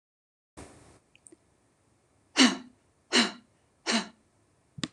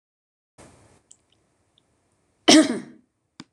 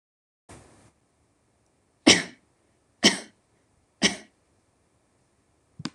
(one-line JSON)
{"exhalation_length": "4.9 s", "exhalation_amplitude": 15008, "exhalation_signal_mean_std_ratio": 0.26, "cough_length": "3.5 s", "cough_amplitude": 26027, "cough_signal_mean_std_ratio": 0.22, "three_cough_length": "5.9 s", "three_cough_amplitude": 26027, "three_cough_signal_mean_std_ratio": 0.19, "survey_phase": "beta (2021-08-13 to 2022-03-07)", "age": "45-64", "gender": "Female", "wearing_mask": "No", "symptom_none": true, "smoker_status": "Ex-smoker", "respiratory_condition_asthma": false, "respiratory_condition_other": false, "recruitment_source": "Test and Trace", "submission_delay": "1 day", "covid_test_result": "Negative", "covid_test_method": "RT-qPCR"}